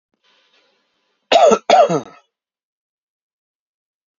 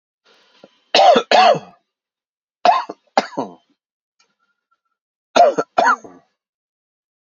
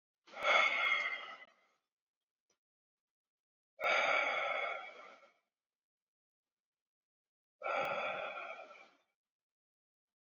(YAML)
cough_length: 4.2 s
cough_amplitude: 28053
cough_signal_mean_std_ratio: 0.3
three_cough_length: 7.3 s
three_cough_amplitude: 30326
three_cough_signal_mean_std_ratio: 0.34
exhalation_length: 10.2 s
exhalation_amplitude: 4908
exhalation_signal_mean_std_ratio: 0.42
survey_phase: beta (2021-08-13 to 2022-03-07)
age: 18-44
gender: Male
wearing_mask: 'No'
symptom_cough_any: true
symptom_runny_or_blocked_nose: true
symptom_sore_throat: true
symptom_diarrhoea: true
symptom_onset: 7 days
smoker_status: Ex-smoker
respiratory_condition_asthma: false
respiratory_condition_other: false
recruitment_source: Test and Trace
submission_delay: 2 days
covid_test_result: Positive
covid_test_method: ePCR